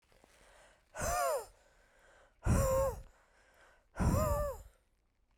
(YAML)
exhalation_length: 5.4 s
exhalation_amplitude: 4011
exhalation_signal_mean_std_ratio: 0.48
survey_phase: beta (2021-08-13 to 2022-03-07)
age: 18-44
gender: Female
wearing_mask: 'No'
symptom_cough_any: true
symptom_new_continuous_cough: true
symptom_runny_or_blocked_nose: true
symptom_fatigue: true
symptom_fever_high_temperature: true
symptom_headache: true
symptom_change_to_sense_of_smell_or_taste: true
symptom_loss_of_taste: true
symptom_onset: 6 days
smoker_status: Never smoked
respiratory_condition_asthma: false
respiratory_condition_other: false
recruitment_source: Test and Trace
submission_delay: 2 days
covid_test_result: Positive
covid_test_method: RT-qPCR
covid_ct_value: 17.3
covid_ct_gene: ORF1ab gene
covid_ct_mean: 17.6
covid_viral_load: 1600000 copies/ml
covid_viral_load_category: High viral load (>1M copies/ml)